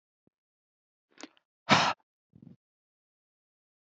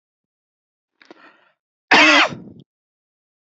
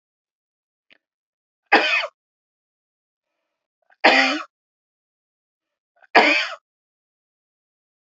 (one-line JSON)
{"exhalation_length": "3.9 s", "exhalation_amplitude": 13166, "exhalation_signal_mean_std_ratio": 0.19, "cough_length": "3.4 s", "cough_amplitude": 32767, "cough_signal_mean_std_ratio": 0.28, "three_cough_length": "8.1 s", "three_cough_amplitude": 28063, "three_cough_signal_mean_std_ratio": 0.26, "survey_phase": "beta (2021-08-13 to 2022-03-07)", "age": "45-64", "gender": "Male", "wearing_mask": "No", "symptom_runny_or_blocked_nose": true, "smoker_status": "Never smoked", "respiratory_condition_asthma": false, "respiratory_condition_other": false, "recruitment_source": "REACT", "submission_delay": "1 day", "covid_test_result": "Negative", "covid_test_method": "RT-qPCR"}